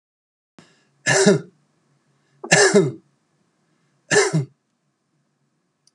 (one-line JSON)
{"three_cough_length": "5.9 s", "three_cough_amplitude": 32759, "three_cough_signal_mean_std_ratio": 0.33, "survey_phase": "beta (2021-08-13 to 2022-03-07)", "age": "65+", "gender": "Male", "wearing_mask": "No", "symptom_none": true, "smoker_status": "Ex-smoker", "respiratory_condition_asthma": false, "respiratory_condition_other": false, "recruitment_source": "REACT", "submission_delay": "3 days", "covid_test_result": "Negative", "covid_test_method": "RT-qPCR"}